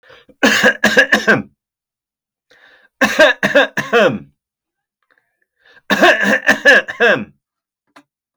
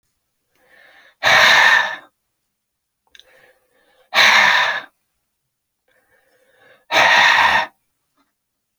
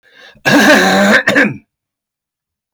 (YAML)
three_cough_length: 8.4 s
three_cough_amplitude: 32768
three_cough_signal_mean_std_ratio: 0.46
exhalation_length: 8.8 s
exhalation_amplitude: 31947
exhalation_signal_mean_std_ratio: 0.41
cough_length: 2.7 s
cough_amplitude: 32768
cough_signal_mean_std_ratio: 0.57
survey_phase: beta (2021-08-13 to 2022-03-07)
age: 45-64
gender: Male
wearing_mask: 'No'
symptom_none: true
smoker_status: Never smoked
respiratory_condition_asthma: false
respiratory_condition_other: false
recruitment_source: REACT
submission_delay: 2 days
covid_test_result: Negative
covid_test_method: RT-qPCR